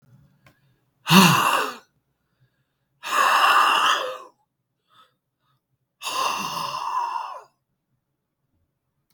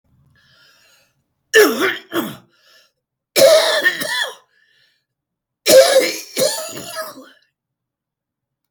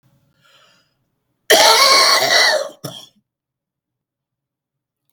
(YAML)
exhalation_length: 9.1 s
exhalation_amplitude: 32768
exhalation_signal_mean_std_ratio: 0.42
three_cough_length: 8.7 s
three_cough_amplitude: 32768
three_cough_signal_mean_std_ratio: 0.39
cough_length: 5.1 s
cough_amplitude: 32768
cough_signal_mean_std_ratio: 0.41
survey_phase: beta (2021-08-13 to 2022-03-07)
age: 65+
gender: Male
wearing_mask: 'No'
symptom_cough_any: true
symptom_new_continuous_cough: true
symptom_fatigue: true
symptom_onset: 12 days
smoker_status: Ex-smoker
respiratory_condition_asthma: false
respiratory_condition_other: true
recruitment_source: REACT
submission_delay: 4 days
covid_test_result: Negative
covid_test_method: RT-qPCR
influenza_a_test_result: Unknown/Void
influenza_b_test_result: Unknown/Void